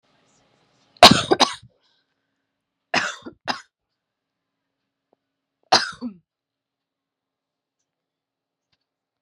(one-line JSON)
{"three_cough_length": "9.2 s", "three_cough_amplitude": 32768, "three_cough_signal_mean_std_ratio": 0.18, "survey_phase": "beta (2021-08-13 to 2022-03-07)", "age": "18-44", "gender": "Female", "wearing_mask": "No", "symptom_runny_or_blocked_nose": true, "symptom_fatigue": true, "symptom_loss_of_taste": true, "symptom_other": true, "symptom_onset": "7 days", "smoker_status": "Never smoked", "respiratory_condition_asthma": false, "respiratory_condition_other": false, "recruitment_source": "REACT", "submission_delay": "1 day", "covid_test_result": "Positive", "covid_test_method": "RT-qPCR", "covid_ct_value": 18.6, "covid_ct_gene": "E gene", "influenza_a_test_result": "Negative", "influenza_b_test_result": "Negative"}